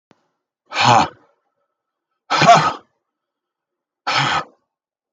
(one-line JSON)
{"exhalation_length": "5.1 s", "exhalation_amplitude": 32691, "exhalation_signal_mean_std_ratio": 0.35, "survey_phase": "beta (2021-08-13 to 2022-03-07)", "age": "45-64", "gender": "Male", "wearing_mask": "No", "symptom_cough_any": true, "symptom_runny_or_blocked_nose": true, "symptom_sore_throat": true, "symptom_abdominal_pain": true, "symptom_diarrhoea": true, "symptom_fever_high_temperature": true, "symptom_headache": true, "symptom_change_to_sense_of_smell_or_taste": true, "symptom_onset": "3 days", "smoker_status": "Never smoked", "respiratory_condition_asthma": false, "respiratory_condition_other": false, "recruitment_source": "Test and Trace", "submission_delay": "1 day", "covid_test_result": "Positive", "covid_test_method": "RT-qPCR"}